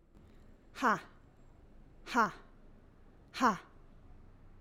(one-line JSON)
{"exhalation_length": "4.6 s", "exhalation_amplitude": 4980, "exhalation_signal_mean_std_ratio": 0.34, "survey_phase": "alpha (2021-03-01 to 2021-08-12)", "age": "45-64", "gender": "Female", "wearing_mask": "No", "symptom_none": true, "symptom_onset": "3 days", "smoker_status": "Never smoked", "respiratory_condition_asthma": false, "respiratory_condition_other": false, "recruitment_source": "Test and Trace", "submission_delay": "2 days", "covid_test_result": "Positive", "covid_test_method": "RT-qPCR", "covid_ct_value": 24.6, "covid_ct_gene": "ORF1ab gene", "covid_ct_mean": 25.1, "covid_viral_load": "5700 copies/ml", "covid_viral_load_category": "Minimal viral load (< 10K copies/ml)"}